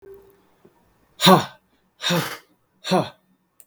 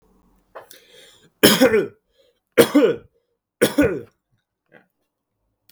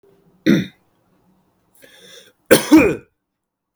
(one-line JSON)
{"exhalation_length": "3.7 s", "exhalation_amplitude": 32766, "exhalation_signal_mean_std_ratio": 0.31, "three_cough_length": "5.7 s", "three_cough_amplitude": 32768, "three_cough_signal_mean_std_ratio": 0.33, "cough_length": "3.8 s", "cough_amplitude": 32768, "cough_signal_mean_std_ratio": 0.3, "survey_phase": "beta (2021-08-13 to 2022-03-07)", "age": "18-44", "gender": "Male", "wearing_mask": "No", "symptom_none": true, "smoker_status": "Never smoked", "respiratory_condition_asthma": false, "respiratory_condition_other": false, "recruitment_source": "REACT", "submission_delay": "1 day", "covid_test_result": "Negative", "covid_test_method": "RT-qPCR"}